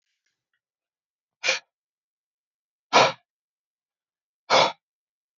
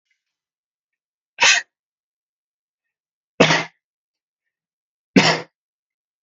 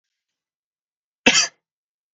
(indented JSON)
{
  "exhalation_length": "5.4 s",
  "exhalation_amplitude": 24268,
  "exhalation_signal_mean_std_ratio": 0.23,
  "three_cough_length": "6.2 s",
  "three_cough_amplitude": 32768,
  "three_cough_signal_mean_std_ratio": 0.24,
  "cough_length": "2.1 s",
  "cough_amplitude": 32768,
  "cough_signal_mean_std_ratio": 0.23,
  "survey_phase": "beta (2021-08-13 to 2022-03-07)",
  "age": "18-44",
  "gender": "Male",
  "wearing_mask": "No",
  "symptom_none": true,
  "symptom_onset": "12 days",
  "smoker_status": "Never smoked",
  "respiratory_condition_asthma": false,
  "respiratory_condition_other": false,
  "recruitment_source": "REACT",
  "submission_delay": "1 day",
  "covid_test_result": "Negative",
  "covid_test_method": "RT-qPCR",
  "influenza_a_test_result": "Negative",
  "influenza_b_test_result": "Negative"
}